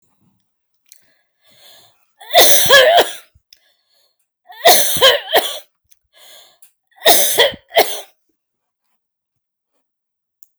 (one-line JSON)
{"three_cough_length": "10.6 s", "three_cough_amplitude": 32768, "three_cough_signal_mean_std_ratio": 0.37, "survey_phase": "alpha (2021-03-01 to 2021-08-12)", "age": "45-64", "gender": "Female", "wearing_mask": "No", "symptom_none": true, "smoker_status": "Never smoked", "respiratory_condition_asthma": false, "respiratory_condition_other": false, "recruitment_source": "REACT", "submission_delay": "2 days", "covid_test_result": "Negative", "covid_test_method": "RT-qPCR"}